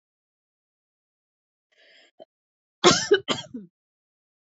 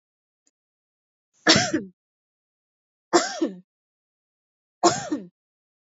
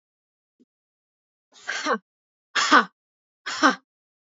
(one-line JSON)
{"cough_length": "4.4 s", "cough_amplitude": 27568, "cough_signal_mean_std_ratio": 0.22, "three_cough_length": "5.9 s", "three_cough_amplitude": 30832, "three_cough_signal_mean_std_ratio": 0.28, "exhalation_length": "4.3 s", "exhalation_amplitude": 25941, "exhalation_signal_mean_std_ratio": 0.28, "survey_phase": "alpha (2021-03-01 to 2021-08-12)", "age": "18-44", "gender": "Female", "wearing_mask": "No", "symptom_none": true, "smoker_status": "Ex-smoker", "respiratory_condition_asthma": false, "respiratory_condition_other": false, "recruitment_source": "REACT", "submission_delay": "1 day", "covid_test_result": "Negative", "covid_test_method": "RT-qPCR"}